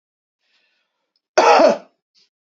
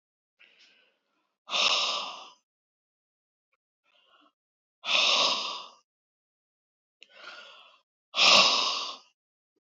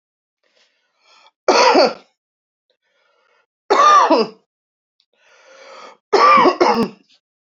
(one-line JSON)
{"cough_length": "2.6 s", "cough_amplitude": 31332, "cough_signal_mean_std_ratio": 0.32, "exhalation_length": "9.6 s", "exhalation_amplitude": 17885, "exhalation_signal_mean_std_ratio": 0.35, "three_cough_length": "7.4 s", "three_cough_amplitude": 30519, "three_cough_signal_mean_std_ratio": 0.41, "survey_phase": "beta (2021-08-13 to 2022-03-07)", "age": "45-64", "gender": "Female", "wearing_mask": "No", "symptom_none": true, "symptom_onset": "12 days", "smoker_status": "Current smoker (11 or more cigarettes per day)", "respiratory_condition_asthma": false, "respiratory_condition_other": false, "recruitment_source": "REACT", "submission_delay": "2 days", "covid_test_result": "Negative", "covid_test_method": "RT-qPCR", "influenza_a_test_result": "Negative", "influenza_b_test_result": "Negative"}